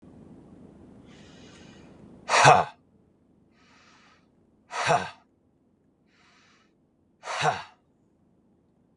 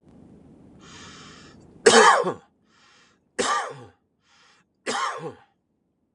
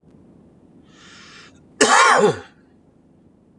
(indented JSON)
{
  "exhalation_length": "9.0 s",
  "exhalation_amplitude": 25379,
  "exhalation_signal_mean_std_ratio": 0.25,
  "three_cough_length": "6.1 s",
  "three_cough_amplitude": 28856,
  "three_cough_signal_mean_std_ratio": 0.31,
  "cough_length": "3.6 s",
  "cough_amplitude": 31388,
  "cough_signal_mean_std_ratio": 0.35,
  "survey_phase": "beta (2021-08-13 to 2022-03-07)",
  "age": "45-64",
  "gender": "Male",
  "wearing_mask": "No",
  "symptom_none": true,
  "smoker_status": "Ex-smoker",
  "respiratory_condition_asthma": false,
  "respiratory_condition_other": false,
  "recruitment_source": "REACT",
  "submission_delay": "11 days",
  "covid_test_result": "Negative",
  "covid_test_method": "RT-qPCR",
  "influenza_a_test_result": "Unknown/Void",
  "influenza_b_test_result": "Unknown/Void"
}